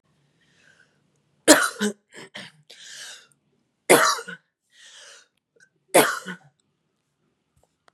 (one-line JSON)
{"three_cough_length": "7.9 s", "three_cough_amplitude": 32767, "three_cough_signal_mean_std_ratio": 0.25, "survey_phase": "beta (2021-08-13 to 2022-03-07)", "age": "18-44", "gender": "Female", "wearing_mask": "No", "symptom_sore_throat": true, "symptom_fatigue": true, "smoker_status": "Current smoker (e-cigarettes or vapes only)", "respiratory_condition_asthma": false, "respiratory_condition_other": false, "recruitment_source": "Test and Trace", "submission_delay": "1 day", "covid_test_result": "Positive", "covid_test_method": "RT-qPCR", "covid_ct_value": 19.3, "covid_ct_gene": "N gene", "covid_ct_mean": 20.0, "covid_viral_load": "270000 copies/ml", "covid_viral_load_category": "Low viral load (10K-1M copies/ml)"}